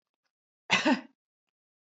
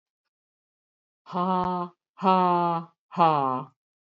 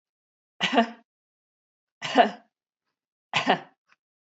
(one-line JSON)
{"cough_length": "2.0 s", "cough_amplitude": 9073, "cough_signal_mean_std_ratio": 0.28, "exhalation_length": "4.0 s", "exhalation_amplitude": 17064, "exhalation_signal_mean_std_ratio": 0.47, "three_cough_length": "4.4 s", "three_cough_amplitude": 20763, "three_cough_signal_mean_std_ratio": 0.28, "survey_phase": "beta (2021-08-13 to 2022-03-07)", "age": "45-64", "gender": "Female", "wearing_mask": "Yes", "symptom_none": true, "smoker_status": "Never smoked", "respiratory_condition_asthma": false, "respiratory_condition_other": false, "recruitment_source": "REACT", "submission_delay": "2 days", "covid_test_result": "Negative", "covid_test_method": "RT-qPCR", "influenza_a_test_result": "Negative", "influenza_b_test_result": "Negative"}